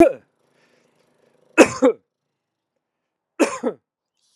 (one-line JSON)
{"three_cough_length": "4.4 s", "three_cough_amplitude": 32768, "three_cough_signal_mean_std_ratio": 0.25, "survey_phase": "alpha (2021-03-01 to 2021-08-12)", "age": "45-64", "gender": "Male", "wearing_mask": "No", "symptom_cough_any": true, "symptom_change_to_sense_of_smell_or_taste": true, "symptom_loss_of_taste": true, "symptom_onset": "3 days", "smoker_status": "Never smoked", "respiratory_condition_asthma": false, "respiratory_condition_other": false, "recruitment_source": "Test and Trace", "submission_delay": "2 days", "covid_test_result": "Positive", "covid_test_method": "RT-qPCR", "covid_ct_value": 13.0, "covid_ct_gene": "N gene", "covid_ct_mean": 13.9, "covid_viral_load": "28000000 copies/ml", "covid_viral_load_category": "High viral load (>1M copies/ml)"}